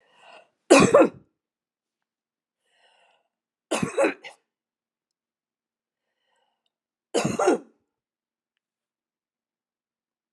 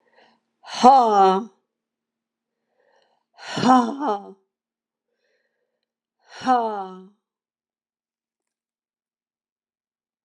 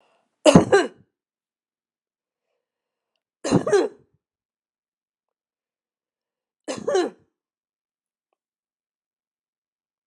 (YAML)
three_cough_length: 10.3 s
three_cough_amplitude: 29962
three_cough_signal_mean_std_ratio: 0.23
exhalation_length: 10.2 s
exhalation_amplitude: 32545
exhalation_signal_mean_std_ratio: 0.29
cough_length: 10.1 s
cough_amplitude: 32768
cough_signal_mean_std_ratio: 0.22
survey_phase: alpha (2021-03-01 to 2021-08-12)
age: 65+
gender: Female
wearing_mask: 'No'
symptom_none: true
smoker_status: Never smoked
respiratory_condition_asthma: true
respiratory_condition_other: false
recruitment_source: REACT
submission_delay: 1 day
covid_test_result: Negative
covid_test_method: RT-qPCR